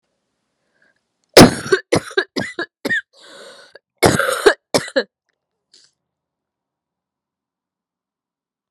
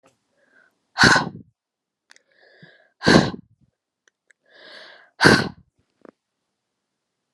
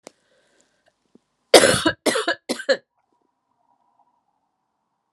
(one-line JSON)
{"cough_length": "8.7 s", "cough_amplitude": 32768, "cough_signal_mean_std_ratio": 0.26, "exhalation_length": "7.3 s", "exhalation_amplitude": 32768, "exhalation_signal_mean_std_ratio": 0.25, "three_cough_length": "5.1 s", "three_cough_amplitude": 32768, "three_cough_signal_mean_std_ratio": 0.26, "survey_phase": "beta (2021-08-13 to 2022-03-07)", "age": "45-64", "gender": "Female", "wearing_mask": "No", "symptom_cough_any": true, "symptom_runny_or_blocked_nose": true, "symptom_fatigue": true, "symptom_onset": "5 days", "smoker_status": "Never smoked", "respiratory_condition_asthma": false, "respiratory_condition_other": false, "recruitment_source": "Test and Trace", "submission_delay": "3 days", "covid_test_result": "Positive", "covid_test_method": "RT-qPCR", "covid_ct_value": 26.0, "covid_ct_gene": "ORF1ab gene", "covid_ct_mean": 26.6, "covid_viral_load": "1900 copies/ml", "covid_viral_load_category": "Minimal viral load (< 10K copies/ml)"}